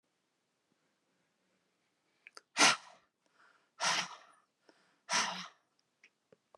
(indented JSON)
{
  "exhalation_length": "6.6 s",
  "exhalation_amplitude": 10885,
  "exhalation_signal_mean_std_ratio": 0.25,
  "survey_phase": "beta (2021-08-13 to 2022-03-07)",
  "age": "45-64",
  "gender": "Female",
  "wearing_mask": "No",
  "symptom_none": true,
  "smoker_status": "Ex-smoker",
  "respiratory_condition_asthma": false,
  "respiratory_condition_other": false,
  "recruitment_source": "REACT",
  "submission_delay": "1 day",
  "covid_test_result": "Negative",
  "covid_test_method": "RT-qPCR",
  "influenza_a_test_result": "Negative",
  "influenza_b_test_result": "Negative"
}